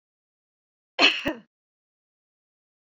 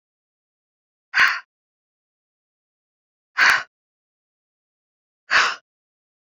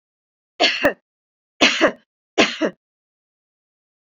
cough_length: 3.0 s
cough_amplitude: 25013
cough_signal_mean_std_ratio: 0.22
exhalation_length: 6.3 s
exhalation_amplitude: 23711
exhalation_signal_mean_std_ratio: 0.25
three_cough_length: 4.1 s
three_cough_amplitude: 32767
three_cough_signal_mean_std_ratio: 0.33
survey_phase: beta (2021-08-13 to 2022-03-07)
age: 65+
gender: Female
wearing_mask: 'No'
symptom_none: true
smoker_status: Never smoked
respiratory_condition_asthma: true
respiratory_condition_other: false
recruitment_source: REACT
submission_delay: 2 days
covid_test_result: Negative
covid_test_method: RT-qPCR
influenza_a_test_result: Negative
influenza_b_test_result: Negative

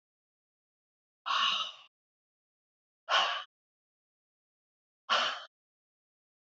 exhalation_length: 6.5 s
exhalation_amplitude: 6468
exhalation_signal_mean_std_ratio: 0.31
survey_phase: beta (2021-08-13 to 2022-03-07)
age: 65+
gender: Female
wearing_mask: 'No'
symptom_none: true
smoker_status: Never smoked
respiratory_condition_asthma: false
respiratory_condition_other: false
recruitment_source: REACT
submission_delay: 1 day
covid_test_result: Negative
covid_test_method: RT-qPCR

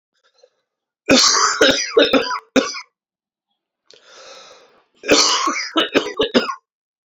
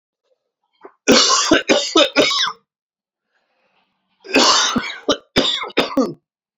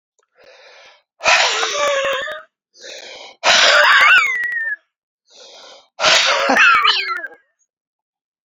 cough_length: 7.1 s
cough_amplitude: 32767
cough_signal_mean_std_ratio: 0.47
three_cough_length: 6.6 s
three_cough_amplitude: 31360
three_cough_signal_mean_std_ratio: 0.5
exhalation_length: 8.4 s
exhalation_amplitude: 32571
exhalation_signal_mean_std_ratio: 0.56
survey_phase: alpha (2021-03-01 to 2021-08-12)
age: 18-44
gender: Male
wearing_mask: 'No'
symptom_new_continuous_cough: true
symptom_shortness_of_breath: true
symptom_fatigue: true
symptom_headache: true
symptom_loss_of_taste: true
smoker_status: Ex-smoker
respiratory_condition_asthma: false
respiratory_condition_other: false
recruitment_source: Test and Trace
submission_delay: 2 days
covid_test_result: Positive
covid_test_method: RT-qPCR
covid_ct_value: 17.3
covid_ct_gene: N gene
covid_ct_mean: 18.8
covid_viral_load: 660000 copies/ml
covid_viral_load_category: Low viral load (10K-1M copies/ml)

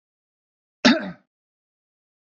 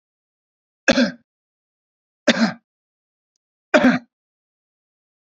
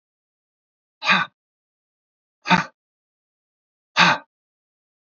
cough_length: 2.2 s
cough_amplitude: 27285
cough_signal_mean_std_ratio: 0.22
three_cough_length: 5.2 s
three_cough_amplitude: 30238
three_cough_signal_mean_std_ratio: 0.27
exhalation_length: 5.1 s
exhalation_amplitude: 29206
exhalation_signal_mean_std_ratio: 0.25
survey_phase: beta (2021-08-13 to 2022-03-07)
age: 65+
gender: Male
wearing_mask: 'No'
symptom_none: true
smoker_status: Ex-smoker
respiratory_condition_asthma: false
respiratory_condition_other: false
recruitment_source: REACT
submission_delay: 3 days
covid_test_result: Negative
covid_test_method: RT-qPCR
influenza_a_test_result: Negative
influenza_b_test_result: Negative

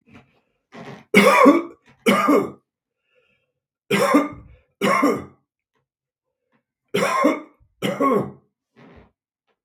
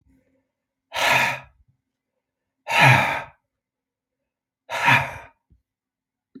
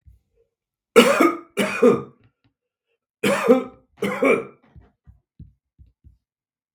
three_cough_length: 9.6 s
three_cough_amplitude: 32766
three_cough_signal_mean_std_ratio: 0.42
exhalation_length: 6.4 s
exhalation_amplitude: 32768
exhalation_signal_mean_std_ratio: 0.34
cough_length: 6.7 s
cough_amplitude: 32768
cough_signal_mean_std_ratio: 0.36
survey_phase: beta (2021-08-13 to 2022-03-07)
age: 65+
gender: Male
wearing_mask: 'No'
symptom_none: true
smoker_status: Never smoked
respiratory_condition_asthma: false
respiratory_condition_other: false
recruitment_source: REACT
submission_delay: 2 days
covid_test_result: Negative
covid_test_method: RT-qPCR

